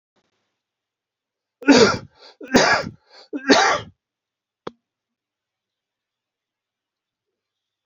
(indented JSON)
{
  "three_cough_length": "7.9 s",
  "three_cough_amplitude": 28190,
  "three_cough_signal_mean_std_ratio": 0.28,
  "survey_phase": "beta (2021-08-13 to 2022-03-07)",
  "age": "45-64",
  "gender": "Male",
  "wearing_mask": "No",
  "symptom_cough_any": true,
  "symptom_runny_or_blocked_nose": true,
  "symptom_fatigue": true,
  "smoker_status": "Ex-smoker",
  "respiratory_condition_asthma": false,
  "respiratory_condition_other": false,
  "recruitment_source": "Test and Trace",
  "submission_delay": "1 day",
  "covid_test_result": "Positive",
  "covid_test_method": "RT-qPCR",
  "covid_ct_value": 28.6,
  "covid_ct_gene": "N gene"
}